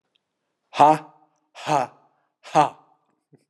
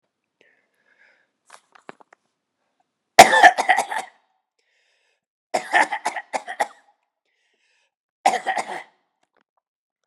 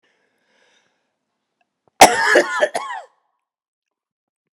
{
  "exhalation_length": "3.5 s",
  "exhalation_amplitude": 29622,
  "exhalation_signal_mean_std_ratio": 0.28,
  "three_cough_length": "10.1 s",
  "three_cough_amplitude": 32768,
  "three_cough_signal_mean_std_ratio": 0.23,
  "cough_length": "4.5 s",
  "cough_amplitude": 32768,
  "cough_signal_mean_std_ratio": 0.27,
  "survey_phase": "beta (2021-08-13 to 2022-03-07)",
  "age": "45-64",
  "gender": "Male",
  "wearing_mask": "No",
  "symptom_none": true,
  "symptom_onset": "12 days",
  "smoker_status": "Never smoked",
  "respiratory_condition_asthma": false,
  "respiratory_condition_other": false,
  "recruitment_source": "REACT",
  "submission_delay": "2 days",
  "covid_test_result": "Negative",
  "covid_test_method": "RT-qPCR"
}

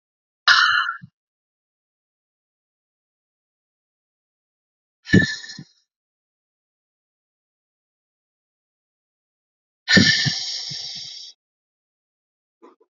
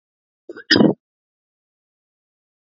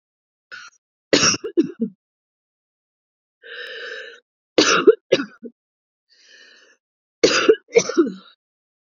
{
  "exhalation_length": "13.0 s",
  "exhalation_amplitude": 29021,
  "exhalation_signal_mean_std_ratio": 0.25,
  "cough_length": "2.6 s",
  "cough_amplitude": 28632,
  "cough_signal_mean_std_ratio": 0.23,
  "three_cough_length": "9.0 s",
  "three_cough_amplitude": 32768,
  "three_cough_signal_mean_std_ratio": 0.32,
  "survey_phase": "beta (2021-08-13 to 2022-03-07)",
  "age": "45-64",
  "gender": "Female",
  "wearing_mask": "No",
  "symptom_runny_or_blocked_nose": true,
  "symptom_onset": "12 days",
  "smoker_status": "Never smoked",
  "respiratory_condition_asthma": true,
  "respiratory_condition_other": false,
  "recruitment_source": "REACT",
  "submission_delay": "1 day",
  "covid_test_result": "Negative",
  "covid_test_method": "RT-qPCR",
  "influenza_a_test_result": "Negative",
  "influenza_b_test_result": "Negative"
}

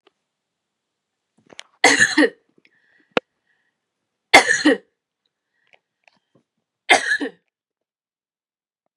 {
  "three_cough_length": "9.0 s",
  "three_cough_amplitude": 32768,
  "three_cough_signal_mean_std_ratio": 0.25,
  "survey_phase": "beta (2021-08-13 to 2022-03-07)",
  "age": "45-64",
  "gender": "Female",
  "wearing_mask": "No",
  "symptom_none": true,
  "smoker_status": "Ex-smoker",
  "respiratory_condition_asthma": false,
  "respiratory_condition_other": false,
  "recruitment_source": "REACT",
  "submission_delay": "2 days",
  "covid_test_result": "Negative",
  "covid_test_method": "RT-qPCR",
  "influenza_a_test_result": "Negative",
  "influenza_b_test_result": "Negative"
}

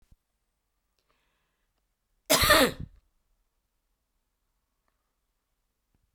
{
  "cough_length": "6.1 s",
  "cough_amplitude": 15819,
  "cough_signal_mean_std_ratio": 0.21,
  "survey_phase": "beta (2021-08-13 to 2022-03-07)",
  "age": "18-44",
  "gender": "Female",
  "wearing_mask": "No",
  "symptom_cough_any": true,
  "symptom_runny_or_blocked_nose": true,
  "symptom_fatigue": true,
  "symptom_fever_high_temperature": true,
  "symptom_headache": true,
  "symptom_change_to_sense_of_smell_or_taste": true,
  "symptom_loss_of_taste": true,
  "symptom_onset": "2 days",
  "smoker_status": "Never smoked",
  "respiratory_condition_asthma": true,
  "respiratory_condition_other": false,
  "recruitment_source": "Test and Trace",
  "submission_delay": "1 day",
  "covid_test_result": "Positive",
  "covid_test_method": "RT-qPCR",
  "covid_ct_value": 18.5,
  "covid_ct_gene": "ORF1ab gene"
}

